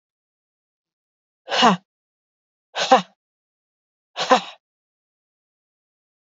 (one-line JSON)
{"exhalation_length": "6.2 s", "exhalation_amplitude": 26376, "exhalation_signal_mean_std_ratio": 0.23, "survey_phase": "beta (2021-08-13 to 2022-03-07)", "age": "18-44", "gender": "Female", "wearing_mask": "No", "symptom_none": true, "smoker_status": "Never smoked", "respiratory_condition_asthma": false, "respiratory_condition_other": false, "recruitment_source": "REACT", "submission_delay": "1 day", "covid_test_result": "Negative", "covid_test_method": "RT-qPCR", "influenza_a_test_result": "Unknown/Void", "influenza_b_test_result": "Unknown/Void"}